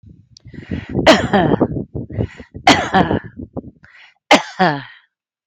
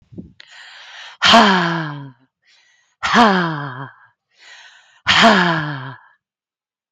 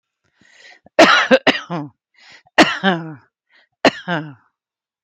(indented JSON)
{
  "three_cough_length": "5.5 s",
  "three_cough_amplitude": 31923,
  "three_cough_signal_mean_std_ratio": 0.47,
  "exhalation_length": "6.9 s",
  "exhalation_amplitude": 32767,
  "exhalation_signal_mean_std_ratio": 0.44,
  "cough_length": "5.0 s",
  "cough_amplitude": 32767,
  "cough_signal_mean_std_ratio": 0.36,
  "survey_phase": "alpha (2021-03-01 to 2021-08-12)",
  "age": "45-64",
  "gender": "Female",
  "wearing_mask": "No",
  "symptom_none": true,
  "smoker_status": "Ex-smoker",
  "respiratory_condition_asthma": false,
  "respiratory_condition_other": false,
  "recruitment_source": "REACT",
  "submission_delay": "2 days",
  "covid_test_result": "Negative",
  "covid_test_method": "RT-qPCR"
}